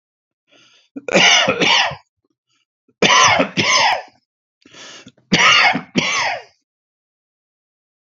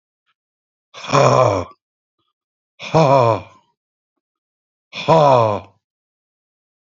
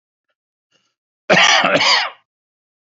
{"three_cough_length": "8.2 s", "three_cough_amplitude": 32768, "three_cough_signal_mean_std_ratio": 0.47, "exhalation_length": "7.0 s", "exhalation_amplitude": 29250, "exhalation_signal_mean_std_ratio": 0.37, "cough_length": "2.9 s", "cough_amplitude": 32767, "cough_signal_mean_std_ratio": 0.43, "survey_phase": "beta (2021-08-13 to 2022-03-07)", "age": "45-64", "gender": "Male", "wearing_mask": "No", "symptom_none": true, "smoker_status": "Never smoked", "respiratory_condition_asthma": false, "respiratory_condition_other": false, "recruitment_source": "REACT", "submission_delay": "2 days", "covid_test_result": "Negative", "covid_test_method": "RT-qPCR", "influenza_a_test_result": "Negative", "influenza_b_test_result": "Negative"}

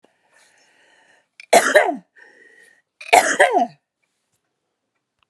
{"cough_length": "5.3 s", "cough_amplitude": 32766, "cough_signal_mean_std_ratio": 0.31, "survey_phase": "alpha (2021-03-01 to 2021-08-12)", "age": "65+", "gender": "Female", "wearing_mask": "No", "symptom_shortness_of_breath": true, "smoker_status": "Never smoked", "respiratory_condition_asthma": true, "respiratory_condition_other": false, "recruitment_source": "REACT", "submission_delay": "20 days", "covid_test_result": "Negative", "covid_test_method": "RT-qPCR"}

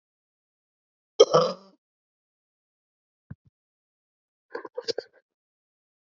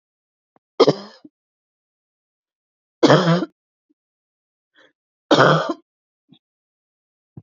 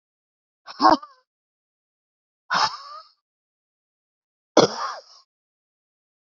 {"cough_length": "6.1 s", "cough_amplitude": 26714, "cough_signal_mean_std_ratio": 0.17, "three_cough_length": "7.4 s", "three_cough_amplitude": 29127, "three_cough_signal_mean_std_ratio": 0.27, "exhalation_length": "6.3 s", "exhalation_amplitude": 29237, "exhalation_signal_mean_std_ratio": 0.23, "survey_phase": "beta (2021-08-13 to 2022-03-07)", "age": "65+", "gender": "Female", "wearing_mask": "No", "symptom_cough_any": true, "symptom_onset": "34 days", "smoker_status": "Ex-smoker", "respiratory_condition_asthma": false, "respiratory_condition_other": false, "recruitment_source": "Test and Trace", "submission_delay": "2 days", "covid_test_result": "Negative", "covid_test_method": "RT-qPCR"}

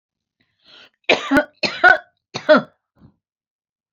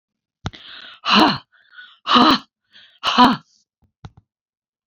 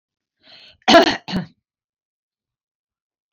{"three_cough_length": "3.9 s", "three_cough_amplitude": 29285, "three_cough_signal_mean_std_ratio": 0.31, "exhalation_length": "4.9 s", "exhalation_amplitude": 32767, "exhalation_signal_mean_std_ratio": 0.36, "cough_length": "3.3 s", "cough_amplitude": 30147, "cough_signal_mean_std_ratio": 0.24, "survey_phase": "beta (2021-08-13 to 2022-03-07)", "age": "65+", "gender": "Female", "wearing_mask": "No", "symptom_runny_or_blocked_nose": true, "symptom_onset": "12 days", "smoker_status": "Never smoked", "respiratory_condition_asthma": false, "respiratory_condition_other": false, "recruitment_source": "REACT", "submission_delay": "1 day", "covid_test_result": "Negative", "covid_test_method": "RT-qPCR"}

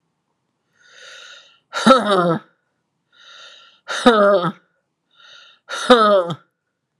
{"exhalation_length": "7.0 s", "exhalation_amplitude": 32768, "exhalation_signal_mean_std_ratio": 0.38, "survey_phase": "alpha (2021-03-01 to 2021-08-12)", "age": "45-64", "gender": "Female", "wearing_mask": "No", "symptom_cough_any": true, "symptom_fatigue": true, "symptom_headache": true, "symptom_onset": "5 days", "smoker_status": "Ex-smoker", "respiratory_condition_asthma": false, "respiratory_condition_other": false, "recruitment_source": "Test and Trace", "submission_delay": "1 day", "covid_test_result": "Positive", "covid_test_method": "RT-qPCR", "covid_ct_value": 12.0, "covid_ct_gene": "ORF1ab gene", "covid_ct_mean": 12.3, "covid_viral_load": "92000000 copies/ml", "covid_viral_load_category": "High viral load (>1M copies/ml)"}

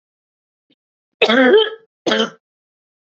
{"cough_length": "3.2 s", "cough_amplitude": 32167, "cough_signal_mean_std_ratio": 0.38, "survey_phase": "beta (2021-08-13 to 2022-03-07)", "age": "45-64", "gender": "Female", "wearing_mask": "No", "symptom_cough_any": true, "symptom_runny_or_blocked_nose": true, "symptom_sore_throat": true, "symptom_fatigue": true, "symptom_fever_high_temperature": true, "symptom_headache": true, "symptom_loss_of_taste": true, "symptom_other": true, "symptom_onset": "5 days", "smoker_status": "Never smoked", "respiratory_condition_asthma": false, "respiratory_condition_other": true, "recruitment_source": "Test and Trace", "submission_delay": "2 days", "covid_test_result": "Positive", "covid_test_method": "RT-qPCR", "covid_ct_value": 18.8, "covid_ct_gene": "ORF1ab gene", "covid_ct_mean": 19.3, "covid_viral_load": "470000 copies/ml", "covid_viral_load_category": "Low viral load (10K-1M copies/ml)"}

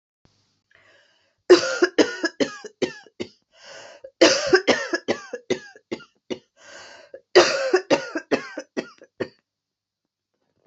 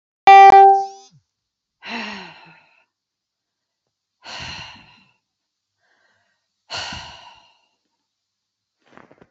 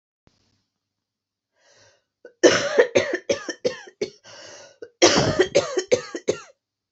{"three_cough_length": "10.7 s", "three_cough_amplitude": 28554, "three_cough_signal_mean_std_ratio": 0.34, "exhalation_length": "9.3 s", "exhalation_amplitude": 26979, "exhalation_signal_mean_std_ratio": 0.25, "cough_length": "6.9 s", "cough_amplitude": 29603, "cough_signal_mean_std_ratio": 0.37, "survey_phase": "beta (2021-08-13 to 2022-03-07)", "age": "45-64", "gender": "Female", "wearing_mask": "Yes", "symptom_cough_any": true, "symptom_runny_or_blocked_nose": true, "symptom_sore_throat": true, "symptom_headache": true, "symptom_onset": "12 days", "smoker_status": "Never smoked", "respiratory_condition_asthma": false, "respiratory_condition_other": false, "recruitment_source": "REACT", "submission_delay": "2 days", "covid_test_result": "Positive", "covid_test_method": "RT-qPCR", "covid_ct_value": 30.3, "covid_ct_gene": "E gene", "influenza_a_test_result": "Negative", "influenza_b_test_result": "Negative"}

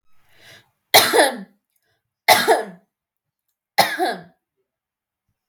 {"three_cough_length": "5.5 s", "three_cough_amplitude": 32768, "three_cough_signal_mean_std_ratio": 0.33, "survey_phase": "beta (2021-08-13 to 2022-03-07)", "age": "18-44", "gender": "Female", "wearing_mask": "No", "symptom_none": true, "smoker_status": "Never smoked", "respiratory_condition_asthma": true, "respiratory_condition_other": false, "recruitment_source": "REACT", "submission_delay": "5 days", "covid_test_result": "Negative", "covid_test_method": "RT-qPCR"}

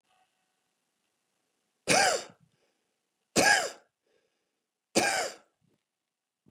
{"three_cough_length": "6.5 s", "three_cough_amplitude": 10593, "three_cough_signal_mean_std_ratio": 0.3, "survey_phase": "beta (2021-08-13 to 2022-03-07)", "age": "45-64", "gender": "Male", "wearing_mask": "No", "symptom_change_to_sense_of_smell_or_taste": true, "smoker_status": "Ex-smoker", "respiratory_condition_asthma": false, "respiratory_condition_other": false, "recruitment_source": "REACT", "submission_delay": "2 days", "covid_test_result": "Negative", "covid_test_method": "RT-qPCR"}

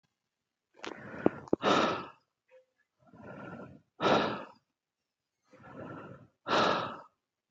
{"exhalation_length": "7.5 s", "exhalation_amplitude": 12444, "exhalation_signal_mean_std_ratio": 0.37, "survey_phase": "beta (2021-08-13 to 2022-03-07)", "age": "45-64", "gender": "Male", "wearing_mask": "Yes", "symptom_none": true, "smoker_status": "Never smoked", "respiratory_condition_asthma": false, "respiratory_condition_other": false, "recruitment_source": "REACT", "submission_delay": "3 days", "covid_test_result": "Negative", "covid_test_method": "RT-qPCR", "influenza_a_test_result": "Negative", "influenza_b_test_result": "Negative"}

